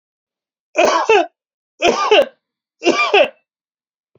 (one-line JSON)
{"three_cough_length": "4.2 s", "three_cough_amplitude": 32427, "three_cough_signal_mean_std_ratio": 0.45, "survey_phase": "alpha (2021-03-01 to 2021-08-12)", "age": "45-64", "gender": "Male", "wearing_mask": "No", "symptom_none": true, "smoker_status": "Never smoked", "respiratory_condition_asthma": false, "respiratory_condition_other": false, "recruitment_source": "REACT", "submission_delay": "31 days", "covid_test_result": "Negative", "covid_test_method": "RT-qPCR"}